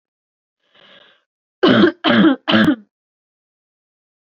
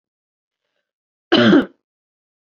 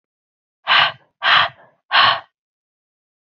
{"three_cough_length": "4.4 s", "three_cough_amplitude": 32768, "three_cough_signal_mean_std_ratio": 0.38, "cough_length": "2.6 s", "cough_amplitude": 27473, "cough_signal_mean_std_ratio": 0.29, "exhalation_length": "3.3 s", "exhalation_amplitude": 30774, "exhalation_signal_mean_std_ratio": 0.38, "survey_phase": "alpha (2021-03-01 to 2021-08-12)", "age": "18-44", "gender": "Female", "wearing_mask": "No", "symptom_cough_any": true, "symptom_new_continuous_cough": true, "symptom_shortness_of_breath": true, "symptom_fatigue": true, "symptom_headache": true, "symptom_onset": "5 days", "smoker_status": "Never smoked", "respiratory_condition_asthma": true, "respiratory_condition_other": false, "recruitment_source": "Test and Trace", "submission_delay": "1 day", "covid_test_result": "Positive", "covid_test_method": "RT-qPCR"}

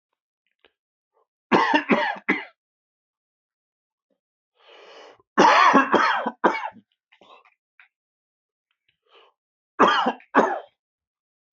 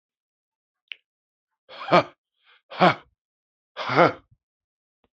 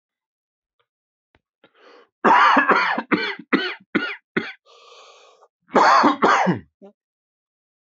{"three_cough_length": "11.5 s", "three_cough_amplitude": 24744, "three_cough_signal_mean_std_ratio": 0.34, "exhalation_length": "5.1 s", "exhalation_amplitude": 25945, "exhalation_signal_mean_std_ratio": 0.24, "cough_length": "7.9 s", "cough_amplitude": 24699, "cough_signal_mean_std_ratio": 0.42, "survey_phase": "beta (2021-08-13 to 2022-03-07)", "age": "18-44", "gender": "Male", "wearing_mask": "No", "symptom_cough_any": true, "symptom_shortness_of_breath": true, "symptom_fatigue": true, "symptom_headache": true, "smoker_status": "Never smoked", "respiratory_condition_asthma": false, "respiratory_condition_other": false, "recruitment_source": "Test and Trace", "submission_delay": "-1 day", "covid_test_result": "Positive", "covid_test_method": "LFT"}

